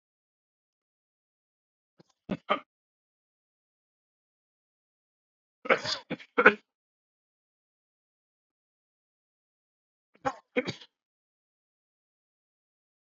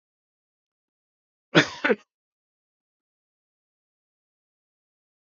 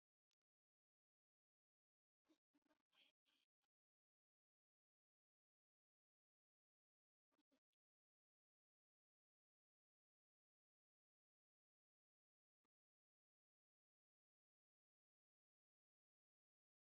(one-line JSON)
{"three_cough_length": "13.1 s", "three_cough_amplitude": 26705, "three_cough_signal_mean_std_ratio": 0.14, "cough_length": "5.3 s", "cough_amplitude": 24899, "cough_signal_mean_std_ratio": 0.15, "exhalation_length": "16.9 s", "exhalation_amplitude": 20, "exhalation_signal_mean_std_ratio": 0.14, "survey_phase": "beta (2021-08-13 to 2022-03-07)", "age": "65+", "gender": "Male", "wearing_mask": "No", "symptom_cough_any": true, "smoker_status": "Ex-smoker", "respiratory_condition_asthma": false, "respiratory_condition_other": false, "recruitment_source": "REACT", "submission_delay": "1 day", "covid_test_result": "Negative", "covid_test_method": "RT-qPCR"}